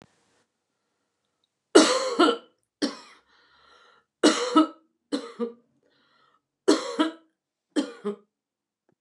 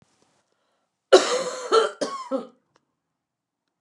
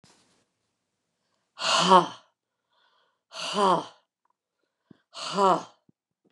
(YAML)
three_cough_length: 9.0 s
three_cough_amplitude: 28990
three_cough_signal_mean_std_ratio: 0.32
cough_length: 3.8 s
cough_amplitude: 28429
cough_signal_mean_std_ratio: 0.32
exhalation_length: 6.3 s
exhalation_amplitude: 21929
exhalation_signal_mean_std_ratio: 0.31
survey_phase: beta (2021-08-13 to 2022-03-07)
age: 65+
gender: Female
wearing_mask: 'No'
symptom_sore_throat: true
symptom_fatigue: true
symptom_headache: true
symptom_onset: 2 days
smoker_status: Ex-smoker
respiratory_condition_asthma: false
respiratory_condition_other: false
recruitment_source: Test and Trace
submission_delay: 1 day
covid_test_method: RT-qPCR